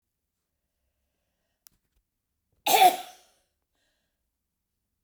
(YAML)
cough_length: 5.0 s
cough_amplitude: 14555
cough_signal_mean_std_ratio: 0.19
survey_phase: beta (2021-08-13 to 2022-03-07)
age: 65+
gender: Female
wearing_mask: 'No'
symptom_cough_any: true
symptom_runny_or_blocked_nose: true
smoker_status: Never smoked
respiratory_condition_asthma: false
respiratory_condition_other: false
recruitment_source: Test and Trace
submission_delay: 2 days
covid_test_result: Positive
covid_test_method: RT-qPCR
covid_ct_value: 20.5
covid_ct_gene: ORF1ab gene
covid_ct_mean: 21.1
covid_viral_load: 120000 copies/ml
covid_viral_load_category: Low viral load (10K-1M copies/ml)